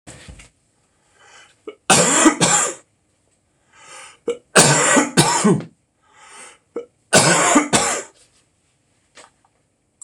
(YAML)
three_cough_length: 10.0 s
three_cough_amplitude: 26028
three_cough_signal_mean_std_ratio: 0.43
survey_phase: beta (2021-08-13 to 2022-03-07)
age: 18-44
gender: Male
wearing_mask: 'No'
symptom_cough_any: true
symptom_shortness_of_breath: true
symptom_sore_throat: true
symptom_fatigue: true
symptom_headache: true
symptom_change_to_sense_of_smell_or_taste: true
smoker_status: Never smoked
respiratory_condition_asthma: false
respiratory_condition_other: false
recruitment_source: Test and Trace
submission_delay: 2 days
covid_test_result: Positive
covid_test_method: RT-qPCR
covid_ct_value: 20.7
covid_ct_gene: ORF1ab gene
covid_ct_mean: 21.2
covid_viral_load: 110000 copies/ml
covid_viral_load_category: Low viral load (10K-1M copies/ml)